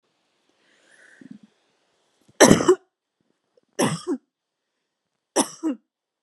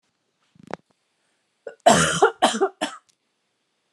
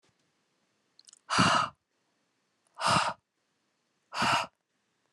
{
  "three_cough_length": "6.2 s",
  "three_cough_amplitude": 32767,
  "three_cough_signal_mean_std_ratio": 0.24,
  "cough_length": "3.9 s",
  "cough_amplitude": 28672,
  "cough_signal_mean_std_ratio": 0.32,
  "exhalation_length": "5.1 s",
  "exhalation_amplitude": 12485,
  "exhalation_signal_mean_std_ratio": 0.36,
  "survey_phase": "alpha (2021-03-01 to 2021-08-12)",
  "age": "18-44",
  "gender": "Female",
  "wearing_mask": "No",
  "symptom_fatigue": true,
  "symptom_onset": "8 days",
  "smoker_status": "Never smoked",
  "respiratory_condition_asthma": false,
  "respiratory_condition_other": false,
  "recruitment_source": "REACT",
  "submission_delay": "3 days",
  "covid_test_method": "RT-qPCR",
  "covid_ct_value": 37.0,
  "covid_ct_gene": "N gene"
}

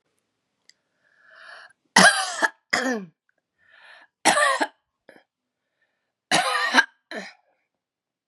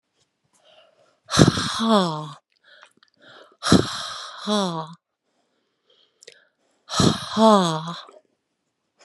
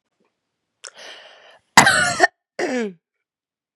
{
  "three_cough_length": "8.3 s",
  "three_cough_amplitude": 30648,
  "three_cough_signal_mean_std_ratio": 0.33,
  "exhalation_length": "9.0 s",
  "exhalation_amplitude": 32768,
  "exhalation_signal_mean_std_ratio": 0.37,
  "cough_length": "3.8 s",
  "cough_amplitude": 32768,
  "cough_signal_mean_std_ratio": 0.31,
  "survey_phase": "beta (2021-08-13 to 2022-03-07)",
  "age": "45-64",
  "gender": "Female",
  "wearing_mask": "No",
  "symptom_none": true,
  "smoker_status": "Never smoked",
  "respiratory_condition_asthma": true,
  "respiratory_condition_other": false,
  "recruitment_source": "REACT",
  "submission_delay": "1 day",
  "covid_test_result": "Negative",
  "covid_test_method": "RT-qPCR",
  "influenza_a_test_result": "Negative",
  "influenza_b_test_result": "Negative"
}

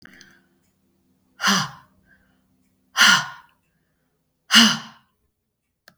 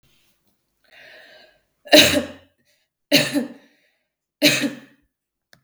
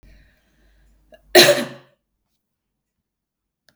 {
  "exhalation_length": "6.0 s",
  "exhalation_amplitude": 32766,
  "exhalation_signal_mean_std_ratio": 0.28,
  "three_cough_length": "5.6 s",
  "three_cough_amplitude": 32768,
  "three_cough_signal_mean_std_ratio": 0.3,
  "cough_length": "3.8 s",
  "cough_amplitude": 32768,
  "cough_signal_mean_std_ratio": 0.21,
  "survey_phase": "beta (2021-08-13 to 2022-03-07)",
  "age": "65+",
  "gender": "Female",
  "wearing_mask": "No",
  "symptom_none": true,
  "smoker_status": "Never smoked",
  "respiratory_condition_asthma": false,
  "respiratory_condition_other": false,
  "recruitment_source": "REACT",
  "submission_delay": "2 days",
  "covid_test_result": "Negative",
  "covid_test_method": "RT-qPCR",
  "influenza_a_test_result": "Negative",
  "influenza_b_test_result": "Negative"
}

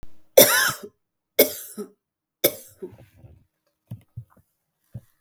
{
  "three_cough_length": "5.2 s",
  "three_cough_amplitude": 32768,
  "three_cough_signal_mean_std_ratio": 0.27,
  "survey_phase": "beta (2021-08-13 to 2022-03-07)",
  "age": "18-44",
  "gender": "Female",
  "wearing_mask": "No",
  "symptom_runny_or_blocked_nose": true,
  "symptom_fatigue": true,
  "symptom_fever_high_temperature": true,
  "symptom_headache": true,
  "smoker_status": "Never smoked",
  "respiratory_condition_asthma": false,
  "respiratory_condition_other": false,
  "recruitment_source": "REACT",
  "submission_delay": "0 days",
  "covid_test_result": "Negative",
  "covid_test_method": "RT-qPCR",
  "influenza_a_test_result": "Negative",
  "influenza_b_test_result": "Negative"
}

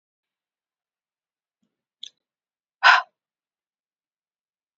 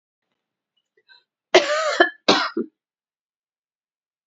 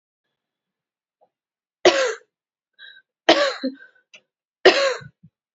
{
  "exhalation_length": "4.8 s",
  "exhalation_amplitude": 29124,
  "exhalation_signal_mean_std_ratio": 0.15,
  "cough_length": "4.3 s",
  "cough_amplitude": 31921,
  "cough_signal_mean_std_ratio": 0.3,
  "three_cough_length": "5.5 s",
  "three_cough_amplitude": 30104,
  "three_cough_signal_mean_std_ratio": 0.29,
  "survey_phase": "alpha (2021-03-01 to 2021-08-12)",
  "age": "18-44",
  "gender": "Female",
  "wearing_mask": "No",
  "symptom_cough_any": true,
  "symptom_shortness_of_breath": true,
  "symptom_fatigue": true,
  "symptom_change_to_sense_of_smell_or_taste": true,
  "symptom_loss_of_taste": true,
  "symptom_onset": "3 days",
  "smoker_status": "Never smoked",
  "respiratory_condition_asthma": false,
  "respiratory_condition_other": false,
  "recruitment_source": "Test and Trace",
  "submission_delay": "2 days",
  "covid_test_result": "Positive",
  "covid_test_method": "RT-qPCR"
}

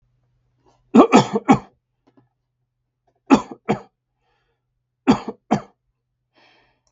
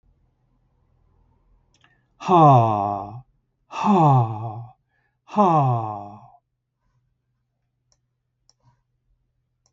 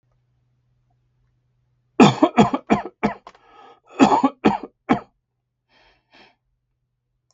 {
  "three_cough_length": "6.9 s",
  "three_cough_amplitude": 32768,
  "three_cough_signal_mean_std_ratio": 0.25,
  "exhalation_length": "9.7 s",
  "exhalation_amplitude": 21877,
  "exhalation_signal_mean_std_ratio": 0.37,
  "cough_length": "7.3 s",
  "cough_amplitude": 32768,
  "cough_signal_mean_std_ratio": 0.28,
  "survey_phase": "beta (2021-08-13 to 2022-03-07)",
  "age": "65+",
  "gender": "Male",
  "wearing_mask": "No",
  "symptom_none": true,
  "smoker_status": "Never smoked",
  "respiratory_condition_asthma": false,
  "respiratory_condition_other": false,
  "recruitment_source": "REACT",
  "submission_delay": "2 days",
  "covid_test_result": "Negative",
  "covid_test_method": "RT-qPCR",
  "influenza_a_test_result": "Negative",
  "influenza_b_test_result": "Negative"
}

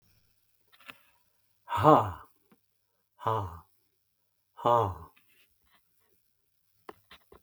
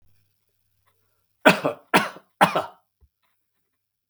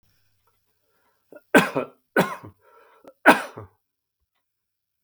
{
  "exhalation_length": "7.4 s",
  "exhalation_amplitude": 17769,
  "exhalation_signal_mean_std_ratio": 0.25,
  "cough_length": "4.1 s",
  "cough_amplitude": 32766,
  "cough_signal_mean_std_ratio": 0.25,
  "three_cough_length": "5.0 s",
  "three_cough_amplitude": 32766,
  "three_cough_signal_mean_std_ratio": 0.23,
  "survey_phase": "beta (2021-08-13 to 2022-03-07)",
  "age": "65+",
  "gender": "Male",
  "wearing_mask": "No",
  "symptom_none": true,
  "smoker_status": "Ex-smoker",
  "respiratory_condition_asthma": true,
  "respiratory_condition_other": false,
  "recruitment_source": "REACT",
  "submission_delay": "2 days",
  "covid_test_result": "Negative",
  "covid_test_method": "RT-qPCR",
  "influenza_a_test_result": "Negative",
  "influenza_b_test_result": "Negative"
}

